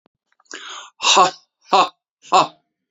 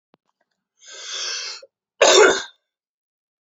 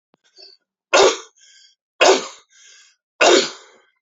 {"exhalation_length": "2.9 s", "exhalation_amplitude": 31864, "exhalation_signal_mean_std_ratio": 0.37, "cough_length": "3.4 s", "cough_amplitude": 32767, "cough_signal_mean_std_ratio": 0.33, "three_cough_length": "4.0 s", "three_cough_amplitude": 32389, "three_cough_signal_mean_std_ratio": 0.35, "survey_phase": "beta (2021-08-13 to 2022-03-07)", "age": "18-44", "gender": "Male", "wearing_mask": "No", "symptom_none": true, "smoker_status": "Never smoked", "respiratory_condition_asthma": true, "respiratory_condition_other": false, "recruitment_source": "Test and Trace", "submission_delay": "0 days", "covid_test_result": "Negative", "covid_test_method": "LFT"}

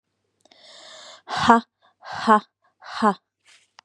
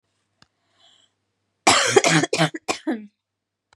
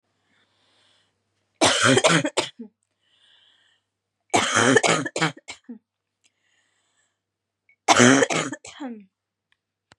{"exhalation_length": "3.8 s", "exhalation_amplitude": 32671, "exhalation_signal_mean_std_ratio": 0.31, "cough_length": "3.8 s", "cough_amplitude": 31300, "cough_signal_mean_std_ratio": 0.37, "three_cough_length": "10.0 s", "three_cough_amplitude": 31580, "three_cough_signal_mean_std_ratio": 0.35, "survey_phase": "beta (2021-08-13 to 2022-03-07)", "age": "18-44", "gender": "Female", "wearing_mask": "No", "symptom_cough_any": true, "symptom_new_continuous_cough": true, "symptom_runny_or_blocked_nose": true, "symptom_sore_throat": true, "symptom_fatigue": true, "symptom_headache": true, "symptom_other": true, "symptom_onset": "3 days", "smoker_status": "Never smoked", "respiratory_condition_asthma": false, "respiratory_condition_other": false, "recruitment_source": "Test and Trace", "submission_delay": "1 day", "covid_test_result": "Positive", "covid_test_method": "ePCR"}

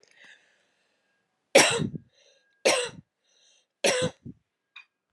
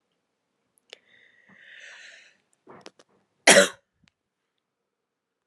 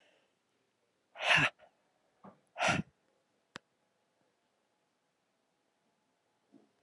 {"three_cough_length": "5.1 s", "three_cough_amplitude": 23015, "three_cough_signal_mean_std_ratio": 0.3, "cough_length": "5.5 s", "cough_amplitude": 31710, "cough_signal_mean_std_ratio": 0.16, "exhalation_length": "6.8 s", "exhalation_amplitude": 6567, "exhalation_signal_mean_std_ratio": 0.22, "survey_phase": "beta (2021-08-13 to 2022-03-07)", "age": "45-64", "gender": "Female", "wearing_mask": "No", "symptom_cough_any": true, "symptom_runny_or_blocked_nose": true, "symptom_headache": true, "symptom_change_to_sense_of_smell_or_taste": true, "smoker_status": "Never smoked", "respiratory_condition_asthma": false, "respiratory_condition_other": false, "recruitment_source": "Test and Trace", "submission_delay": "2 days", "covid_test_result": "Positive", "covid_test_method": "RT-qPCR", "covid_ct_value": 18.0, "covid_ct_gene": "ORF1ab gene", "covid_ct_mean": 18.9, "covid_viral_load": "640000 copies/ml", "covid_viral_load_category": "Low viral load (10K-1M copies/ml)"}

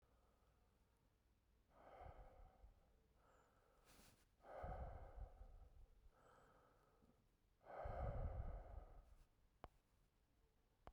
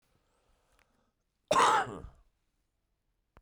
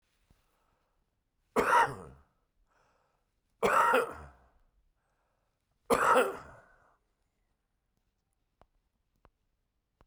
{"exhalation_length": "10.9 s", "exhalation_amplitude": 440, "exhalation_signal_mean_std_ratio": 0.48, "cough_length": "3.4 s", "cough_amplitude": 8884, "cough_signal_mean_std_ratio": 0.28, "three_cough_length": "10.1 s", "three_cough_amplitude": 8364, "three_cough_signal_mean_std_ratio": 0.29, "survey_phase": "beta (2021-08-13 to 2022-03-07)", "age": "45-64", "gender": "Male", "wearing_mask": "No", "symptom_cough_any": true, "symptom_runny_or_blocked_nose": true, "symptom_shortness_of_breath": true, "symptom_headache": true, "symptom_onset": "3 days", "smoker_status": "Ex-smoker", "respiratory_condition_asthma": false, "respiratory_condition_other": true, "recruitment_source": "Test and Trace", "submission_delay": "2 days", "covid_test_result": "Positive", "covid_test_method": "RT-qPCR", "covid_ct_value": 16.3, "covid_ct_gene": "ORF1ab gene", "covid_ct_mean": 16.6, "covid_viral_load": "3600000 copies/ml", "covid_viral_load_category": "High viral load (>1M copies/ml)"}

